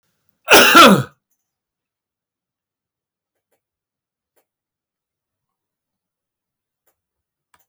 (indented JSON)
{
  "cough_length": "7.7 s",
  "cough_amplitude": 32768,
  "cough_signal_mean_std_ratio": 0.21,
  "survey_phase": "alpha (2021-03-01 to 2021-08-12)",
  "age": "65+",
  "gender": "Male",
  "wearing_mask": "No",
  "symptom_none": true,
  "smoker_status": "Ex-smoker",
  "respiratory_condition_asthma": false,
  "respiratory_condition_other": false,
  "recruitment_source": "REACT",
  "submission_delay": "5 days",
  "covid_test_result": "Negative",
  "covid_test_method": "RT-qPCR"
}